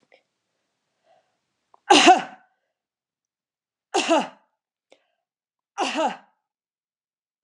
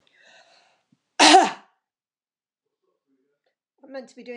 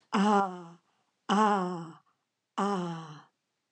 three_cough_length: 7.4 s
three_cough_amplitude: 29493
three_cough_signal_mean_std_ratio: 0.25
cough_length: 4.4 s
cough_amplitude: 30559
cough_signal_mean_std_ratio: 0.23
exhalation_length: 3.7 s
exhalation_amplitude: 8872
exhalation_signal_mean_std_ratio: 0.48
survey_phase: beta (2021-08-13 to 2022-03-07)
age: 65+
gender: Female
wearing_mask: 'No'
symptom_none: true
smoker_status: Never smoked
respiratory_condition_asthma: false
respiratory_condition_other: false
recruitment_source: REACT
submission_delay: 1 day
covid_test_result: Negative
covid_test_method: RT-qPCR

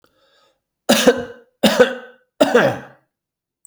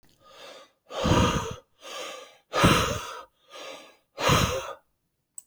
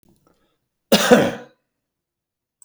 three_cough_length: 3.7 s
three_cough_amplitude: 32642
three_cough_signal_mean_std_ratio: 0.39
exhalation_length: 5.5 s
exhalation_amplitude: 17951
exhalation_signal_mean_std_ratio: 0.46
cough_length: 2.6 s
cough_amplitude: 30007
cough_signal_mean_std_ratio: 0.29
survey_phase: beta (2021-08-13 to 2022-03-07)
age: 45-64
gender: Male
wearing_mask: 'No'
symptom_none: true
smoker_status: Never smoked
respiratory_condition_asthma: false
respiratory_condition_other: false
recruitment_source: REACT
submission_delay: 6 days
covid_test_result: Negative
covid_test_method: RT-qPCR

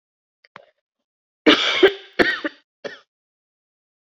three_cough_length: 4.2 s
three_cough_amplitude: 28479
three_cough_signal_mean_std_ratio: 0.29
survey_phase: beta (2021-08-13 to 2022-03-07)
age: 45-64
gender: Female
wearing_mask: 'No'
symptom_runny_or_blocked_nose: true
symptom_fatigue: true
symptom_fever_high_temperature: true
symptom_headache: true
smoker_status: Never smoked
respiratory_condition_asthma: false
respiratory_condition_other: false
recruitment_source: Test and Trace
submission_delay: 2 days
covid_test_result: Positive
covid_test_method: LFT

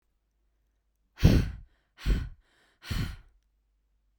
exhalation_length: 4.2 s
exhalation_amplitude: 16687
exhalation_signal_mean_std_ratio: 0.3
survey_phase: beta (2021-08-13 to 2022-03-07)
age: 18-44
gender: Female
wearing_mask: 'No'
symptom_cough_any: true
symptom_runny_or_blocked_nose: true
symptom_sore_throat: true
symptom_fatigue: true
symptom_headache: true
smoker_status: Never smoked
respiratory_condition_asthma: false
respiratory_condition_other: false
recruitment_source: Test and Trace
submission_delay: 2 days
covid_test_result: Positive
covid_test_method: RT-qPCR
covid_ct_value: 16.3
covid_ct_gene: ORF1ab gene
covid_ct_mean: 16.5
covid_viral_load: 3800000 copies/ml
covid_viral_load_category: High viral load (>1M copies/ml)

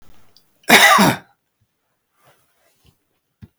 cough_length: 3.6 s
cough_amplitude: 32768
cough_signal_mean_std_ratio: 0.3
survey_phase: beta (2021-08-13 to 2022-03-07)
age: 65+
gender: Male
wearing_mask: 'No'
symptom_none: true
smoker_status: Ex-smoker
respiratory_condition_asthma: false
respiratory_condition_other: false
recruitment_source: REACT
submission_delay: 1 day
covid_test_result: Negative
covid_test_method: RT-qPCR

